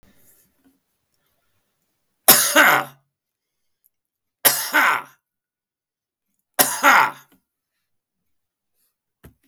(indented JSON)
{
  "three_cough_length": "9.5 s",
  "three_cough_amplitude": 32768,
  "three_cough_signal_mean_std_ratio": 0.29,
  "survey_phase": "beta (2021-08-13 to 2022-03-07)",
  "age": "65+",
  "gender": "Male",
  "wearing_mask": "No",
  "symptom_none": true,
  "smoker_status": "Never smoked",
  "respiratory_condition_asthma": false,
  "respiratory_condition_other": false,
  "recruitment_source": "REACT",
  "submission_delay": "2 days",
  "covid_test_result": "Negative",
  "covid_test_method": "RT-qPCR",
  "influenza_a_test_result": "Negative",
  "influenza_b_test_result": "Negative"
}